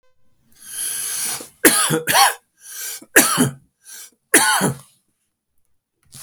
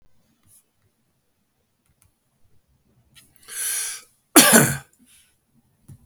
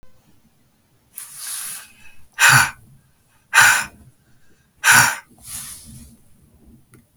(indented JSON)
{
  "three_cough_length": "6.2 s",
  "three_cough_amplitude": 32768,
  "three_cough_signal_mean_std_ratio": 0.44,
  "cough_length": "6.1 s",
  "cough_amplitude": 32768,
  "cough_signal_mean_std_ratio": 0.24,
  "exhalation_length": "7.2 s",
  "exhalation_amplitude": 32768,
  "exhalation_signal_mean_std_ratio": 0.33,
  "survey_phase": "beta (2021-08-13 to 2022-03-07)",
  "age": "45-64",
  "gender": "Male",
  "wearing_mask": "No",
  "symptom_abdominal_pain": true,
  "symptom_onset": "13 days",
  "smoker_status": "Never smoked",
  "respiratory_condition_asthma": false,
  "respiratory_condition_other": false,
  "recruitment_source": "REACT",
  "submission_delay": "1 day",
  "covid_test_result": "Negative",
  "covid_test_method": "RT-qPCR",
  "influenza_a_test_result": "Negative",
  "influenza_b_test_result": "Negative"
}